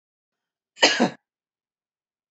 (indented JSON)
{
  "cough_length": "2.3 s",
  "cough_amplitude": 28769,
  "cough_signal_mean_std_ratio": 0.25,
  "survey_phase": "beta (2021-08-13 to 2022-03-07)",
  "age": "65+",
  "gender": "Female",
  "wearing_mask": "No",
  "symptom_cough_any": true,
  "smoker_status": "Never smoked",
  "respiratory_condition_asthma": true,
  "respiratory_condition_other": false,
  "recruitment_source": "REACT",
  "submission_delay": "2 days",
  "covid_test_result": "Negative",
  "covid_test_method": "RT-qPCR",
  "influenza_a_test_result": "Negative",
  "influenza_b_test_result": "Negative"
}